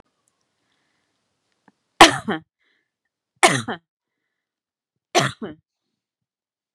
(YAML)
three_cough_length: 6.7 s
three_cough_amplitude: 32768
three_cough_signal_mean_std_ratio: 0.19
survey_phase: beta (2021-08-13 to 2022-03-07)
age: 45-64
gender: Female
wearing_mask: 'No'
symptom_fatigue: true
smoker_status: Ex-smoker
respiratory_condition_asthma: false
respiratory_condition_other: false
recruitment_source: REACT
submission_delay: 4 days
covid_test_result: Negative
covid_test_method: RT-qPCR